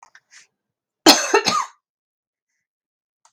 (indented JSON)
{
  "cough_length": "3.3 s",
  "cough_amplitude": 32768,
  "cough_signal_mean_std_ratio": 0.26,
  "survey_phase": "beta (2021-08-13 to 2022-03-07)",
  "age": "45-64",
  "gender": "Female",
  "wearing_mask": "No",
  "symptom_cough_any": true,
  "symptom_shortness_of_breath": true,
  "symptom_onset": "12 days",
  "smoker_status": "Never smoked",
  "respiratory_condition_asthma": false,
  "respiratory_condition_other": false,
  "recruitment_source": "REACT",
  "submission_delay": "3 days",
  "covid_test_result": "Negative",
  "covid_test_method": "RT-qPCR"
}